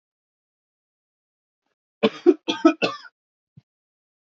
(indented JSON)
{
  "three_cough_length": "4.3 s",
  "three_cough_amplitude": 25976,
  "three_cough_signal_mean_std_ratio": 0.22,
  "survey_phase": "beta (2021-08-13 to 2022-03-07)",
  "age": "18-44",
  "gender": "Male",
  "wearing_mask": "No",
  "symptom_none": true,
  "smoker_status": "Ex-smoker",
  "respiratory_condition_asthma": false,
  "respiratory_condition_other": false,
  "recruitment_source": "REACT",
  "submission_delay": "1 day",
  "covid_test_result": "Negative",
  "covid_test_method": "RT-qPCR"
}